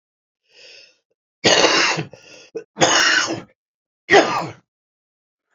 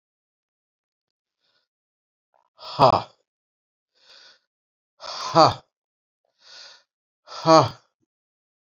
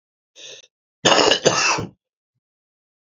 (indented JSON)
{
  "three_cough_length": "5.5 s",
  "three_cough_amplitude": 29210,
  "three_cough_signal_mean_std_ratio": 0.42,
  "exhalation_length": "8.6 s",
  "exhalation_amplitude": 27808,
  "exhalation_signal_mean_std_ratio": 0.21,
  "cough_length": "3.1 s",
  "cough_amplitude": 32768,
  "cough_signal_mean_std_ratio": 0.39,
  "survey_phase": "alpha (2021-03-01 to 2021-08-12)",
  "age": "65+",
  "gender": "Male",
  "wearing_mask": "No",
  "symptom_cough_any": true,
  "symptom_new_continuous_cough": true,
  "symptom_fatigue": true,
  "symptom_headache": true,
  "symptom_onset": "3 days",
  "smoker_status": "Ex-smoker",
  "respiratory_condition_asthma": false,
  "respiratory_condition_other": false,
  "recruitment_source": "Test and Trace",
  "submission_delay": "1 day",
  "covid_test_result": "Positive",
  "covid_test_method": "RT-qPCR",
  "covid_ct_value": 14.8,
  "covid_ct_gene": "ORF1ab gene",
  "covid_ct_mean": 15.3,
  "covid_viral_load": "9300000 copies/ml",
  "covid_viral_load_category": "High viral load (>1M copies/ml)"
}